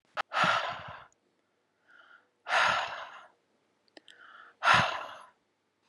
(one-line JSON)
{"exhalation_length": "5.9 s", "exhalation_amplitude": 10598, "exhalation_signal_mean_std_ratio": 0.39, "survey_phase": "alpha (2021-03-01 to 2021-08-12)", "age": "45-64", "gender": "Female", "wearing_mask": "No", "symptom_none": true, "smoker_status": "Current smoker (11 or more cigarettes per day)", "respiratory_condition_asthma": false, "respiratory_condition_other": false, "recruitment_source": "REACT", "submission_delay": "1 day", "covid_test_result": "Negative", "covid_test_method": "RT-qPCR"}